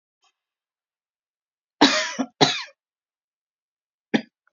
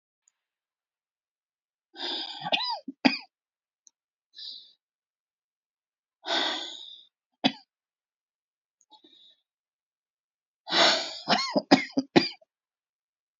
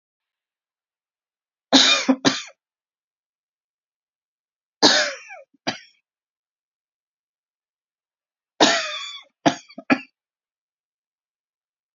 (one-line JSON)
{"cough_length": "4.5 s", "cough_amplitude": 28274, "cough_signal_mean_std_ratio": 0.25, "exhalation_length": "13.4 s", "exhalation_amplitude": 23880, "exhalation_signal_mean_std_ratio": 0.28, "three_cough_length": "11.9 s", "three_cough_amplitude": 32768, "three_cough_signal_mean_std_ratio": 0.26, "survey_phase": "beta (2021-08-13 to 2022-03-07)", "age": "18-44", "gender": "Female", "wearing_mask": "No", "symptom_cough_any": true, "symptom_sore_throat": true, "symptom_fatigue": true, "symptom_fever_high_temperature": true, "symptom_headache": true, "symptom_onset": "3 days", "smoker_status": "Never smoked", "respiratory_condition_asthma": false, "respiratory_condition_other": false, "recruitment_source": "Test and Trace", "submission_delay": "2 days", "covid_test_result": "Positive", "covid_test_method": "RT-qPCR", "covid_ct_value": 24.5, "covid_ct_gene": "S gene"}